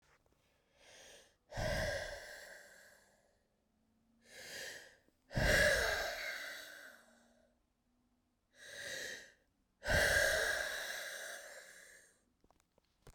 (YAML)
exhalation_length: 13.1 s
exhalation_amplitude: 3621
exhalation_signal_mean_std_ratio: 0.44
survey_phase: beta (2021-08-13 to 2022-03-07)
age: 45-64
gender: Female
wearing_mask: 'No'
symptom_cough_any: true
symptom_new_continuous_cough: true
symptom_runny_or_blocked_nose: true
symptom_sore_throat: true
symptom_fatigue: true
symptom_fever_high_temperature: true
symptom_headache: true
symptom_change_to_sense_of_smell_or_taste: true
symptom_loss_of_taste: true
symptom_other: true
symptom_onset: 6 days
smoker_status: Never smoked
respiratory_condition_asthma: false
respiratory_condition_other: false
recruitment_source: Test and Trace
submission_delay: 2 days
covid_test_result: Positive
covid_test_method: RT-qPCR
covid_ct_value: 20.2
covid_ct_gene: ORF1ab gene